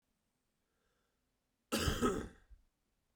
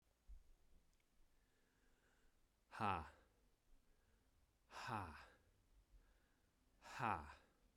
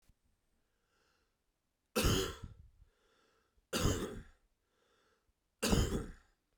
{"cough_length": "3.2 s", "cough_amplitude": 3029, "cough_signal_mean_std_ratio": 0.33, "exhalation_length": "7.8 s", "exhalation_amplitude": 1222, "exhalation_signal_mean_std_ratio": 0.33, "three_cough_length": "6.6 s", "three_cough_amplitude": 4361, "three_cough_signal_mean_std_ratio": 0.35, "survey_phase": "beta (2021-08-13 to 2022-03-07)", "age": "18-44", "gender": "Male", "wearing_mask": "No", "symptom_cough_any": true, "symptom_runny_or_blocked_nose": true, "symptom_onset": "5 days", "smoker_status": "Never smoked", "respiratory_condition_asthma": false, "respiratory_condition_other": false, "recruitment_source": "REACT", "submission_delay": "2 days", "covid_test_result": "Negative", "covid_test_method": "RT-qPCR"}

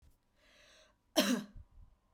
{"cough_length": "2.1 s", "cough_amplitude": 6050, "cough_signal_mean_std_ratio": 0.31, "survey_phase": "beta (2021-08-13 to 2022-03-07)", "age": "18-44", "gender": "Female", "wearing_mask": "No", "symptom_none": true, "smoker_status": "Never smoked", "respiratory_condition_asthma": false, "respiratory_condition_other": false, "recruitment_source": "REACT", "submission_delay": "4 days", "covid_test_result": "Negative", "covid_test_method": "RT-qPCR"}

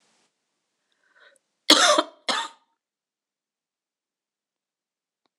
{"cough_length": "5.4 s", "cough_amplitude": 26028, "cough_signal_mean_std_ratio": 0.22, "survey_phase": "beta (2021-08-13 to 2022-03-07)", "age": "45-64", "gender": "Female", "wearing_mask": "No", "symptom_cough_any": true, "symptom_runny_or_blocked_nose": true, "symptom_fatigue": true, "symptom_headache": true, "smoker_status": "Never smoked", "respiratory_condition_asthma": false, "respiratory_condition_other": false, "recruitment_source": "Test and Trace", "submission_delay": "2 days", "covid_test_result": "Positive", "covid_test_method": "RT-qPCR"}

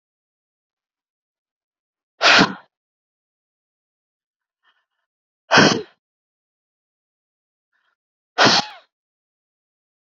{"exhalation_length": "10.1 s", "exhalation_amplitude": 29633, "exhalation_signal_mean_std_ratio": 0.22, "survey_phase": "beta (2021-08-13 to 2022-03-07)", "age": "45-64", "gender": "Female", "wearing_mask": "No", "symptom_cough_any": true, "symptom_fatigue": true, "smoker_status": "Never smoked", "respiratory_condition_asthma": false, "respiratory_condition_other": false, "recruitment_source": "REACT", "submission_delay": "3 days", "covid_test_result": "Negative", "covid_test_method": "RT-qPCR", "influenza_a_test_result": "Negative", "influenza_b_test_result": "Negative"}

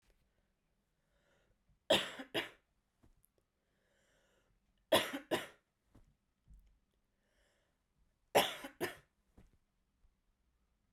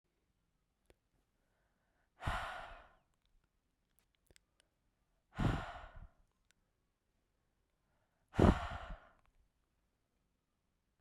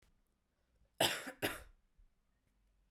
{"three_cough_length": "10.9 s", "three_cough_amplitude": 6772, "three_cough_signal_mean_std_ratio": 0.22, "exhalation_length": "11.0 s", "exhalation_amplitude": 6192, "exhalation_signal_mean_std_ratio": 0.21, "cough_length": "2.9 s", "cough_amplitude": 4085, "cough_signal_mean_std_ratio": 0.28, "survey_phase": "beta (2021-08-13 to 2022-03-07)", "age": "18-44", "gender": "Female", "wearing_mask": "No", "symptom_runny_or_blocked_nose": true, "symptom_headache": true, "symptom_change_to_sense_of_smell_or_taste": true, "symptom_loss_of_taste": true, "symptom_onset": "3 days", "smoker_status": "Never smoked", "respiratory_condition_asthma": false, "respiratory_condition_other": false, "recruitment_source": "Test and Trace", "submission_delay": "2 days", "covid_test_result": "Positive", "covid_test_method": "ePCR"}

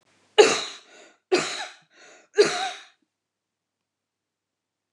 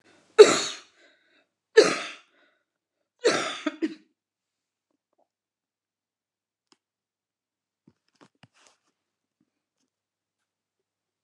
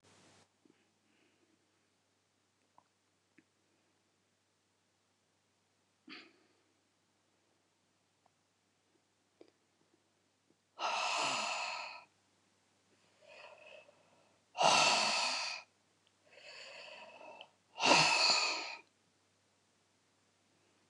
{"cough_length": "4.9 s", "cough_amplitude": 27831, "cough_signal_mean_std_ratio": 0.28, "three_cough_length": "11.2 s", "three_cough_amplitude": 29204, "three_cough_signal_mean_std_ratio": 0.17, "exhalation_length": "20.9 s", "exhalation_amplitude": 7401, "exhalation_signal_mean_std_ratio": 0.3, "survey_phase": "alpha (2021-03-01 to 2021-08-12)", "age": "65+", "gender": "Female", "wearing_mask": "No", "symptom_none": true, "smoker_status": "Ex-smoker", "respiratory_condition_asthma": false, "respiratory_condition_other": false, "recruitment_source": "Test and Trace", "submission_delay": "1 day", "covid_test_result": "Negative", "covid_test_method": "LFT"}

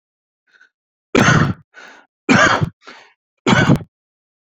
{"three_cough_length": "4.5 s", "three_cough_amplitude": 32295, "three_cough_signal_mean_std_ratio": 0.41, "survey_phase": "beta (2021-08-13 to 2022-03-07)", "age": "45-64", "gender": "Male", "wearing_mask": "No", "symptom_none": true, "smoker_status": "Current smoker (e-cigarettes or vapes only)", "respiratory_condition_asthma": true, "respiratory_condition_other": false, "recruitment_source": "REACT", "submission_delay": "1 day", "covid_test_result": "Negative", "covid_test_method": "RT-qPCR"}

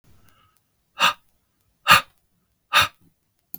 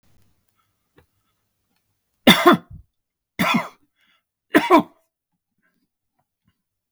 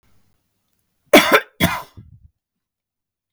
{"exhalation_length": "3.6 s", "exhalation_amplitude": 32112, "exhalation_signal_mean_std_ratio": 0.25, "three_cough_length": "6.9 s", "three_cough_amplitude": 32768, "three_cough_signal_mean_std_ratio": 0.24, "cough_length": "3.3 s", "cough_amplitude": 32768, "cough_signal_mean_std_ratio": 0.26, "survey_phase": "beta (2021-08-13 to 2022-03-07)", "age": "65+", "gender": "Male", "wearing_mask": "No", "symptom_none": true, "smoker_status": "Ex-smoker", "respiratory_condition_asthma": false, "respiratory_condition_other": false, "recruitment_source": "REACT", "submission_delay": "1 day", "covid_test_result": "Negative", "covid_test_method": "RT-qPCR", "influenza_a_test_result": "Negative", "influenza_b_test_result": "Negative"}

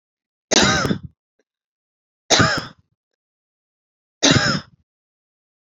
{"three_cough_length": "5.7 s", "three_cough_amplitude": 30985, "three_cough_signal_mean_std_ratio": 0.35, "survey_phase": "beta (2021-08-13 to 2022-03-07)", "age": "45-64", "gender": "Female", "wearing_mask": "No", "symptom_none": true, "smoker_status": "Never smoked", "respiratory_condition_asthma": false, "respiratory_condition_other": false, "recruitment_source": "REACT", "submission_delay": "3 days", "covid_test_result": "Negative", "covid_test_method": "RT-qPCR"}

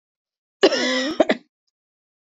{"cough_length": "2.2 s", "cough_amplitude": 26415, "cough_signal_mean_std_ratio": 0.38, "survey_phase": "beta (2021-08-13 to 2022-03-07)", "age": "45-64", "gender": "Female", "wearing_mask": "No", "symptom_cough_any": true, "symptom_runny_or_blocked_nose": true, "symptom_sore_throat": true, "symptom_fatigue": true, "symptom_onset": "6 days", "smoker_status": "Never smoked", "respiratory_condition_asthma": false, "respiratory_condition_other": false, "recruitment_source": "Test and Trace", "submission_delay": "1 day", "covid_test_result": "Positive", "covid_test_method": "RT-qPCR", "covid_ct_value": 24.6, "covid_ct_gene": "N gene"}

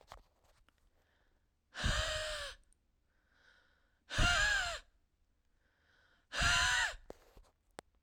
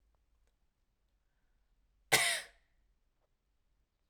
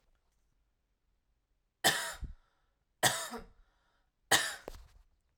{"exhalation_length": "8.0 s", "exhalation_amplitude": 4173, "exhalation_signal_mean_std_ratio": 0.41, "cough_length": "4.1 s", "cough_amplitude": 10093, "cough_signal_mean_std_ratio": 0.21, "three_cough_length": "5.4 s", "three_cough_amplitude": 8381, "three_cough_signal_mean_std_ratio": 0.29, "survey_phase": "alpha (2021-03-01 to 2021-08-12)", "age": "18-44", "gender": "Female", "wearing_mask": "No", "symptom_none": true, "smoker_status": "Never smoked", "respiratory_condition_asthma": false, "respiratory_condition_other": false, "recruitment_source": "REACT", "submission_delay": "1 day", "covid_test_result": "Negative", "covid_test_method": "RT-qPCR"}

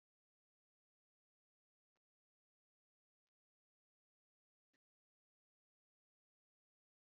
{"exhalation_length": "7.2 s", "exhalation_amplitude": 9, "exhalation_signal_mean_std_ratio": 0.05, "survey_phase": "beta (2021-08-13 to 2022-03-07)", "age": "45-64", "gender": "Female", "wearing_mask": "No", "symptom_cough_any": true, "symptom_fatigue": true, "smoker_status": "Current smoker (1 to 10 cigarettes per day)", "respiratory_condition_asthma": false, "respiratory_condition_other": false, "recruitment_source": "REACT", "submission_delay": "1 day", "covid_test_result": "Negative", "covid_test_method": "RT-qPCR", "influenza_a_test_result": "Negative", "influenza_b_test_result": "Negative"}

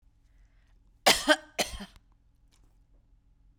{"cough_length": "3.6 s", "cough_amplitude": 19146, "cough_signal_mean_std_ratio": 0.25, "survey_phase": "beta (2021-08-13 to 2022-03-07)", "age": "45-64", "gender": "Female", "wearing_mask": "No", "symptom_none": true, "smoker_status": "Never smoked", "respiratory_condition_asthma": false, "respiratory_condition_other": false, "recruitment_source": "REACT", "submission_delay": "3 days", "covid_test_result": "Negative", "covid_test_method": "RT-qPCR"}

